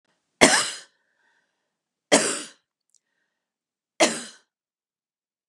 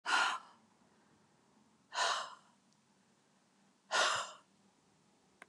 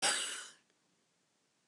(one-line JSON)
{"three_cough_length": "5.5 s", "three_cough_amplitude": 32767, "three_cough_signal_mean_std_ratio": 0.25, "exhalation_length": "5.5 s", "exhalation_amplitude": 3984, "exhalation_signal_mean_std_ratio": 0.36, "cough_length": "1.7 s", "cough_amplitude": 3582, "cough_signal_mean_std_ratio": 0.38, "survey_phase": "beta (2021-08-13 to 2022-03-07)", "age": "65+", "gender": "Female", "wearing_mask": "No", "symptom_none": true, "smoker_status": "Ex-smoker", "respiratory_condition_asthma": false, "respiratory_condition_other": false, "recruitment_source": "REACT", "submission_delay": "3 days", "covid_test_result": "Negative", "covid_test_method": "RT-qPCR", "influenza_a_test_result": "Negative", "influenza_b_test_result": "Negative"}